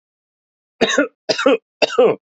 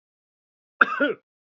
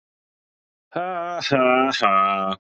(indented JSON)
{
  "three_cough_length": "2.3 s",
  "three_cough_amplitude": 28930,
  "three_cough_signal_mean_std_ratio": 0.45,
  "cough_length": "1.5 s",
  "cough_amplitude": 27438,
  "cough_signal_mean_std_ratio": 0.28,
  "exhalation_length": "2.7 s",
  "exhalation_amplitude": 21993,
  "exhalation_signal_mean_std_ratio": 0.65,
  "survey_phase": "beta (2021-08-13 to 2022-03-07)",
  "age": "18-44",
  "gender": "Male",
  "wearing_mask": "Yes",
  "symptom_cough_any": true,
  "symptom_runny_or_blocked_nose": true,
  "smoker_status": "Never smoked",
  "respiratory_condition_asthma": false,
  "respiratory_condition_other": false,
  "recruitment_source": "Test and Trace",
  "submission_delay": "2 days",
  "covid_test_result": "Positive",
  "covid_test_method": "LFT"
}